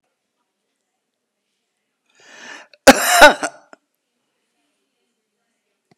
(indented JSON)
{
  "cough_length": "6.0 s",
  "cough_amplitude": 32768,
  "cough_signal_mean_std_ratio": 0.2,
  "survey_phase": "beta (2021-08-13 to 2022-03-07)",
  "age": "65+",
  "gender": "Male",
  "wearing_mask": "No",
  "symptom_none": true,
  "smoker_status": "Ex-smoker",
  "respiratory_condition_asthma": true,
  "respiratory_condition_other": false,
  "recruitment_source": "REACT",
  "submission_delay": "2 days",
  "covid_test_result": "Negative",
  "covid_test_method": "RT-qPCR"
}